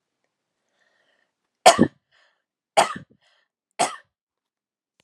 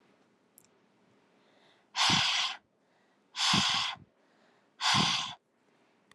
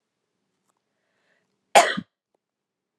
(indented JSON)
{
  "three_cough_length": "5.0 s",
  "three_cough_amplitude": 32767,
  "three_cough_signal_mean_std_ratio": 0.19,
  "exhalation_length": "6.1 s",
  "exhalation_amplitude": 7580,
  "exhalation_signal_mean_std_ratio": 0.44,
  "cough_length": "3.0 s",
  "cough_amplitude": 32191,
  "cough_signal_mean_std_ratio": 0.18,
  "survey_phase": "alpha (2021-03-01 to 2021-08-12)",
  "age": "18-44",
  "gender": "Female",
  "wearing_mask": "No",
  "symptom_cough_any": true,
  "symptom_fatigue": true,
  "symptom_fever_high_temperature": true,
  "symptom_headache": true,
  "symptom_onset": "2 days",
  "smoker_status": "Never smoked",
  "respiratory_condition_asthma": false,
  "respiratory_condition_other": false,
  "recruitment_source": "Test and Trace",
  "submission_delay": "2 days",
  "covid_test_result": "Positive",
  "covid_test_method": "RT-qPCR",
  "covid_ct_value": 18.6,
  "covid_ct_gene": "S gene",
  "covid_ct_mean": 19.1,
  "covid_viral_load": "550000 copies/ml",
  "covid_viral_load_category": "Low viral load (10K-1M copies/ml)"
}